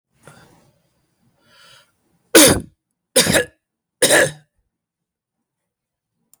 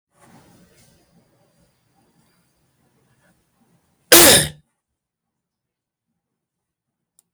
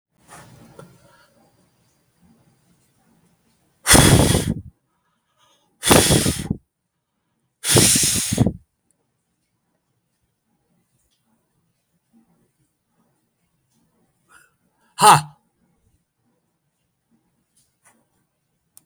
{"three_cough_length": "6.4 s", "three_cough_amplitude": 32768, "three_cough_signal_mean_std_ratio": 0.28, "cough_length": "7.3 s", "cough_amplitude": 32768, "cough_signal_mean_std_ratio": 0.19, "exhalation_length": "18.9 s", "exhalation_amplitude": 32768, "exhalation_signal_mean_std_ratio": 0.26, "survey_phase": "beta (2021-08-13 to 2022-03-07)", "age": "65+", "gender": "Male", "wearing_mask": "No", "symptom_none": true, "smoker_status": "Never smoked", "respiratory_condition_asthma": false, "respiratory_condition_other": false, "recruitment_source": "REACT", "submission_delay": "1 day", "covid_test_result": "Negative", "covid_test_method": "RT-qPCR", "influenza_a_test_result": "Negative", "influenza_b_test_result": "Negative"}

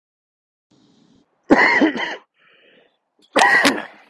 {"cough_length": "4.1 s", "cough_amplitude": 32392, "cough_signal_mean_std_ratio": 0.4, "survey_phase": "beta (2021-08-13 to 2022-03-07)", "age": "18-44", "gender": "Male", "wearing_mask": "No", "symptom_none": true, "smoker_status": "Ex-smoker", "respiratory_condition_asthma": false, "respiratory_condition_other": false, "recruitment_source": "REACT", "submission_delay": "2 days", "covid_test_result": "Negative", "covid_test_method": "RT-qPCR", "influenza_a_test_result": "Negative", "influenza_b_test_result": "Negative"}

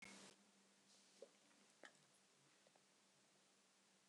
{"cough_length": "4.1 s", "cough_amplitude": 198, "cough_signal_mean_std_ratio": 0.68, "survey_phase": "beta (2021-08-13 to 2022-03-07)", "age": "45-64", "gender": "Female", "wearing_mask": "No", "symptom_none": true, "smoker_status": "Never smoked", "respiratory_condition_asthma": false, "respiratory_condition_other": false, "recruitment_source": "REACT", "submission_delay": "1 day", "covid_test_result": "Negative", "covid_test_method": "RT-qPCR"}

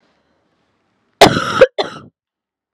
{"cough_length": "2.7 s", "cough_amplitude": 32768, "cough_signal_mean_std_ratio": 0.29, "survey_phase": "beta (2021-08-13 to 2022-03-07)", "age": "18-44", "gender": "Female", "wearing_mask": "No", "symptom_cough_any": true, "symptom_new_continuous_cough": true, "symptom_runny_or_blocked_nose": true, "symptom_sore_throat": true, "symptom_fatigue": true, "symptom_fever_high_temperature": true, "symptom_change_to_sense_of_smell_or_taste": true, "symptom_loss_of_taste": true, "symptom_onset": "3 days", "smoker_status": "Never smoked", "respiratory_condition_asthma": false, "respiratory_condition_other": false, "recruitment_source": "Test and Trace", "submission_delay": "2 days", "covid_test_result": "Positive", "covid_test_method": "RT-qPCR", "covid_ct_value": 19.7, "covid_ct_gene": "N gene", "covid_ct_mean": 20.3, "covid_viral_load": "220000 copies/ml", "covid_viral_load_category": "Low viral load (10K-1M copies/ml)"}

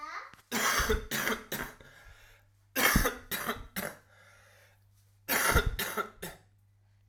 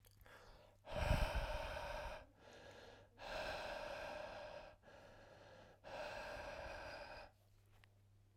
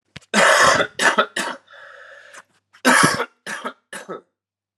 {"three_cough_length": "7.1 s", "three_cough_amplitude": 11320, "three_cough_signal_mean_std_ratio": 0.5, "exhalation_length": "8.4 s", "exhalation_amplitude": 1833, "exhalation_signal_mean_std_ratio": 0.6, "cough_length": "4.8 s", "cough_amplitude": 31981, "cough_signal_mean_std_ratio": 0.46, "survey_phase": "alpha (2021-03-01 to 2021-08-12)", "age": "18-44", "gender": "Male", "wearing_mask": "No", "symptom_new_continuous_cough": true, "symptom_fatigue": true, "symptom_fever_high_temperature": true, "symptom_change_to_sense_of_smell_or_taste": true, "symptom_onset": "5 days", "smoker_status": "Never smoked", "respiratory_condition_asthma": false, "respiratory_condition_other": false, "recruitment_source": "Test and Trace", "submission_delay": "1 day", "covid_test_result": "Positive", "covid_test_method": "RT-qPCR"}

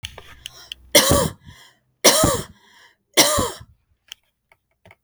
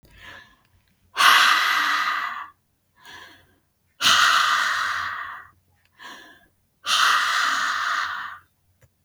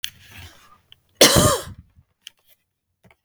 {"three_cough_length": "5.0 s", "three_cough_amplitude": 32768, "three_cough_signal_mean_std_ratio": 0.37, "exhalation_length": "9.0 s", "exhalation_amplitude": 28162, "exhalation_signal_mean_std_ratio": 0.55, "cough_length": "3.2 s", "cough_amplitude": 32768, "cough_signal_mean_std_ratio": 0.28, "survey_phase": "beta (2021-08-13 to 2022-03-07)", "age": "45-64", "gender": "Female", "wearing_mask": "No", "symptom_none": true, "smoker_status": "Ex-smoker", "respiratory_condition_asthma": false, "respiratory_condition_other": false, "recruitment_source": "REACT", "submission_delay": "2 days", "covid_test_result": "Negative", "covid_test_method": "RT-qPCR", "influenza_a_test_result": "Negative", "influenza_b_test_result": "Negative"}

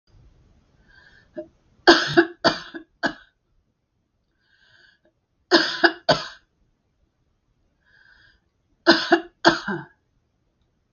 {"three_cough_length": "10.9 s", "three_cough_amplitude": 32768, "three_cough_signal_mean_std_ratio": 0.27, "survey_phase": "beta (2021-08-13 to 2022-03-07)", "age": "65+", "gender": "Female", "wearing_mask": "No", "symptom_none": true, "smoker_status": "Never smoked", "respiratory_condition_asthma": false, "respiratory_condition_other": false, "recruitment_source": "REACT", "submission_delay": "3 days", "covid_test_result": "Negative", "covid_test_method": "RT-qPCR", "influenza_a_test_result": "Negative", "influenza_b_test_result": "Negative"}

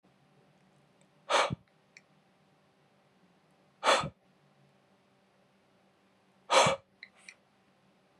{"exhalation_length": "8.2 s", "exhalation_amplitude": 9978, "exhalation_signal_mean_std_ratio": 0.24, "survey_phase": "beta (2021-08-13 to 2022-03-07)", "age": "18-44", "gender": "Male", "wearing_mask": "No", "symptom_none": true, "smoker_status": "Never smoked", "respiratory_condition_asthma": false, "respiratory_condition_other": false, "recruitment_source": "REACT", "submission_delay": "1 day", "covid_test_result": "Negative", "covid_test_method": "RT-qPCR"}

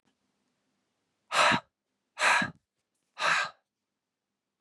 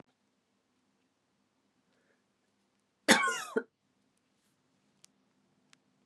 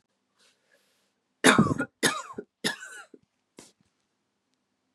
{"exhalation_length": "4.6 s", "exhalation_amplitude": 9905, "exhalation_signal_mean_std_ratio": 0.34, "cough_length": "6.1 s", "cough_amplitude": 13533, "cough_signal_mean_std_ratio": 0.18, "three_cough_length": "4.9 s", "three_cough_amplitude": 28029, "three_cough_signal_mean_std_ratio": 0.26, "survey_phase": "beta (2021-08-13 to 2022-03-07)", "age": "45-64", "gender": "Female", "wearing_mask": "No", "symptom_cough_any": true, "symptom_new_continuous_cough": true, "symptom_runny_or_blocked_nose": true, "symptom_sore_throat": true, "symptom_fatigue": true, "symptom_change_to_sense_of_smell_or_taste": true, "symptom_loss_of_taste": true, "symptom_onset": "3 days", "smoker_status": "Ex-smoker", "respiratory_condition_asthma": false, "respiratory_condition_other": false, "recruitment_source": "Test and Trace", "submission_delay": "1 day", "covid_test_result": "Positive", "covid_test_method": "ePCR"}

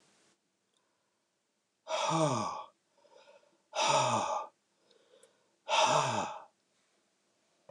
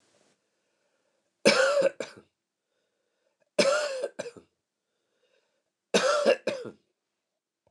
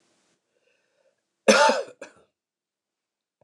{"exhalation_length": "7.7 s", "exhalation_amplitude": 6878, "exhalation_signal_mean_std_ratio": 0.43, "three_cough_length": "7.7 s", "three_cough_amplitude": 17123, "three_cough_signal_mean_std_ratio": 0.35, "cough_length": "3.4 s", "cough_amplitude": 25390, "cough_signal_mean_std_ratio": 0.25, "survey_phase": "beta (2021-08-13 to 2022-03-07)", "age": "45-64", "gender": "Male", "wearing_mask": "No", "symptom_none": true, "smoker_status": "Never smoked", "respiratory_condition_asthma": false, "respiratory_condition_other": false, "recruitment_source": "REACT", "submission_delay": "3 days", "covid_test_result": "Negative", "covid_test_method": "RT-qPCR", "influenza_a_test_result": "Negative", "influenza_b_test_result": "Negative"}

